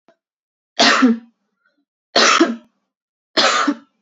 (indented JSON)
{
  "three_cough_length": "4.0 s",
  "three_cough_amplitude": 32767,
  "three_cough_signal_mean_std_ratio": 0.44,
  "survey_phase": "beta (2021-08-13 to 2022-03-07)",
  "age": "18-44",
  "gender": "Female",
  "wearing_mask": "No",
  "symptom_runny_or_blocked_nose": true,
  "symptom_onset": "12 days",
  "smoker_status": "Ex-smoker",
  "respiratory_condition_asthma": false,
  "respiratory_condition_other": false,
  "recruitment_source": "REACT",
  "submission_delay": "1 day",
  "covid_test_result": "Negative",
  "covid_test_method": "RT-qPCR",
  "influenza_a_test_result": "Negative",
  "influenza_b_test_result": "Negative"
}